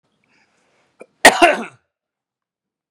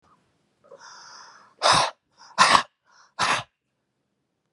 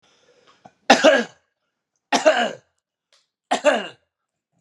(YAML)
cough_length: 2.9 s
cough_amplitude: 32768
cough_signal_mean_std_ratio: 0.23
exhalation_length: 4.5 s
exhalation_amplitude: 31241
exhalation_signal_mean_std_ratio: 0.32
three_cough_length: 4.6 s
three_cough_amplitude: 32767
three_cough_signal_mean_std_ratio: 0.33
survey_phase: beta (2021-08-13 to 2022-03-07)
age: 45-64
gender: Male
wearing_mask: 'No'
symptom_none: true
smoker_status: Ex-smoker
respiratory_condition_asthma: true
respiratory_condition_other: false
recruitment_source: REACT
submission_delay: 5 days
covid_test_result: Negative
covid_test_method: RT-qPCR